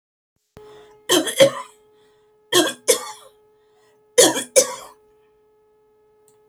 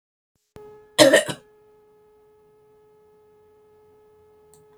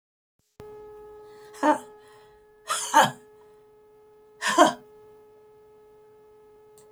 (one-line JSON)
{"three_cough_length": "6.5 s", "three_cough_amplitude": 32768, "three_cough_signal_mean_std_ratio": 0.31, "cough_length": "4.8 s", "cough_amplitude": 26369, "cough_signal_mean_std_ratio": 0.21, "exhalation_length": "6.9 s", "exhalation_amplitude": 22927, "exhalation_signal_mean_std_ratio": 0.29, "survey_phase": "beta (2021-08-13 to 2022-03-07)", "age": "65+", "gender": "Female", "wearing_mask": "No", "symptom_none": true, "smoker_status": "Ex-smoker", "respiratory_condition_asthma": false, "respiratory_condition_other": false, "recruitment_source": "REACT", "submission_delay": "1 day", "covid_test_result": "Negative", "covid_test_method": "RT-qPCR"}